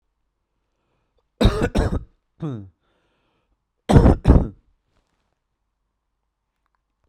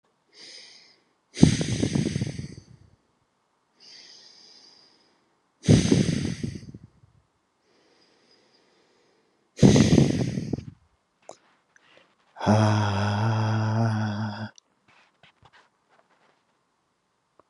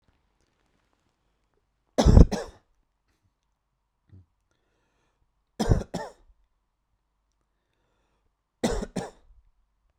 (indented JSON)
{
  "cough_length": "7.1 s",
  "cough_amplitude": 32768,
  "cough_signal_mean_std_ratio": 0.28,
  "exhalation_length": "17.5 s",
  "exhalation_amplitude": 32765,
  "exhalation_signal_mean_std_ratio": 0.38,
  "three_cough_length": "10.0 s",
  "three_cough_amplitude": 32767,
  "three_cough_signal_mean_std_ratio": 0.19,
  "survey_phase": "beta (2021-08-13 to 2022-03-07)",
  "age": "18-44",
  "gender": "Male",
  "wearing_mask": "No",
  "symptom_cough_any": true,
  "symptom_runny_or_blocked_nose": true,
  "symptom_shortness_of_breath": true,
  "symptom_sore_throat": true,
  "symptom_fatigue": true,
  "symptom_fever_high_temperature": true,
  "symptom_headache": true,
  "symptom_change_to_sense_of_smell_or_taste": true,
  "symptom_loss_of_taste": true,
  "smoker_status": "Never smoked",
  "respiratory_condition_asthma": false,
  "respiratory_condition_other": false,
  "recruitment_source": "Test and Trace",
  "submission_delay": "3 days",
  "covid_test_result": "Positive",
  "covid_test_method": "RT-qPCR",
  "covid_ct_value": 19.6,
  "covid_ct_gene": "ORF1ab gene",
  "covid_ct_mean": 19.6,
  "covid_viral_load": "370000 copies/ml",
  "covid_viral_load_category": "Low viral load (10K-1M copies/ml)"
}